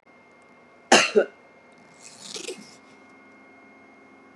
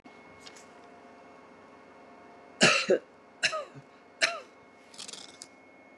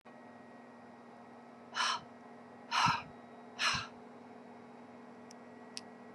{
  "cough_length": "4.4 s",
  "cough_amplitude": 30515,
  "cough_signal_mean_std_ratio": 0.25,
  "three_cough_length": "6.0 s",
  "three_cough_amplitude": 16948,
  "three_cough_signal_mean_std_ratio": 0.32,
  "exhalation_length": "6.1 s",
  "exhalation_amplitude": 4756,
  "exhalation_signal_mean_std_ratio": 0.47,
  "survey_phase": "beta (2021-08-13 to 2022-03-07)",
  "age": "65+",
  "gender": "Female",
  "wearing_mask": "No",
  "symptom_none": true,
  "symptom_onset": "6 days",
  "smoker_status": "Ex-smoker",
  "respiratory_condition_asthma": false,
  "respiratory_condition_other": false,
  "recruitment_source": "REACT",
  "submission_delay": "3 days",
  "covid_test_result": "Negative",
  "covid_test_method": "RT-qPCR",
  "influenza_a_test_result": "Negative",
  "influenza_b_test_result": "Negative"
}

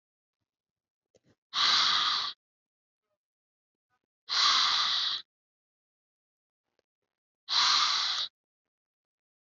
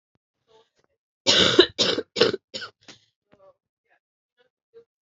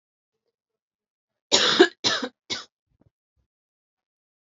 {
  "exhalation_length": "9.6 s",
  "exhalation_amplitude": 8397,
  "exhalation_signal_mean_std_ratio": 0.42,
  "cough_length": "5.0 s",
  "cough_amplitude": 28040,
  "cough_signal_mean_std_ratio": 0.29,
  "three_cough_length": "4.4 s",
  "three_cough_amplitude": 27114,
  "three_cough_signal_mean_std_ratio": 0.26,
  "survey_phase": "alpha (2021-03-01 to 2021-08-12)",
  "age": "18-44",
  "gender": "Female",
  "wearing_mask": "No",
  "symptom_cough_any": true,
  "symptom_fatigue": true,
  "symptom_fever_high_temperature": true,
  "symptom_headache": true,
  "symptom_change_to_sense_of_smell_or_taste": true,
  "symptom_onset": "2 days",
  "smoker_status": "Never smoked",
  "respiratory_condition_asthma": false,
  "respiratory_condition_other": false,
  "recruitment_source": "Test and Trace",
  "submission_delay": "1 day",
  "covid_test_result": "Positive",
  "covid_test_method": "RT-qPCR",
  "covid_ct_value": 33.2,
  "covid_ct_gene": "N gene"
}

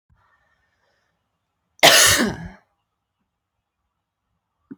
{
  "cough_length": "4.8 s",
  "cough_amplitude": 30836,
  "cough_signal_mean_std_ratio": 0.25,
  "survey_phase": "alpha (2021-03-01 to 2021-08-12)",
  "age": "18-44",
  "gender": "Female",
  "wearing_mask": "No",
  "symptom_cough_any": true,
  "symptom_new_continuous_cough": true,
  "symptom_fever_high_temperature": true,
  "symptom_change_to_sense_of_smell_or_taste": true,
  "symptom_loss_of_taste": true,
  "symptom_onset": "5 days",
  "smoker_status": "Never smoked",
  "respiratory_condition_asthma": false,
  "respiratory_condition_other": false,
  "recruitment_source": "Test and Trace",
  "submission_delay": "2 days",
  "covid_test_result": "Positive",
  "covid_test_method": "RT-qPCR",
  "covid_ct_value": 14.3,
  "covid_ct_gene": "N gene",
  "covid_ct_mean": 14.7,
  "covid_viral_load": "16000000 copies/ml",
  "covid_viral_load_category": "High viral load (>1M copies/ml)"
}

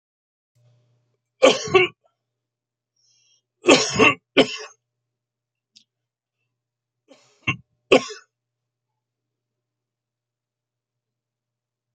{
  "cough_length": "11.9 s",
  "cough_amplitude": 30287,
  "cough_signal_mean_std_ratio": 0.22,
  "survey_phase": "beta (2021-08-13 to 2022-03-07)",
  "age": "65+",
  "gender": "Male",
  "wearing_mask": "No",
  "symptom_none": true,
  "smoker_status": "Never smoked",
  "respiratory_condition_asthma": false,
  "respiratory_condition_other": false,
  "recruitment_source": "REACT",
  "submission_delay": "2 days",
  "covid_test_result": "Negative",
  "covid_test_method": "RT-qPCR"
}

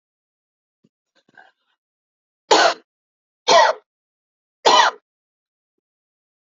{
  "three_cough_length": "6.5 s",
  "three_cough_amplitude": 32768,
  "three_cough_signal_mean_std_ratio": 0.27,
  "survey_phase": "beta (2021-08-13 to 2022-03-07)",
  "age": "18-44",
  "gender": "Female",
  "wearing_mask": "No",
  "symptom_runny_or_blocked_nose": true,
  "smoker_status": "Never smoked",
  "respiratory_condition_asthma": false,
  "respiratory_condition_other": false,
  "recruitment_source": "Test and Trace",
  "submission_delay": "1 day",
  "covid_test_method": "RT-qPCR"
}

